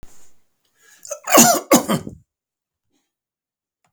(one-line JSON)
{"cough_length": "3.9 s", "cough_amplitude": 32768, "cough_signal_mean_std_ratio": 0.31, "survey_phase": "beta (2021-08-13 to 2022-03-07)", "age": "65+", "gender": "Male", "wearing_mask": "No", "symptom_none": true, "smoker_status": "Ex-smoker", "respiratory_condition_asthma": false, "respiratory_condition_other": false, "recruitment_source": "REACT", "submission_delay": "1 day", "covid_test_result": "Negative", "covid_test_method": "RT-qPCR", "influenza_a_test_result": "Negative", "influenza_b_test_result": "Negative"}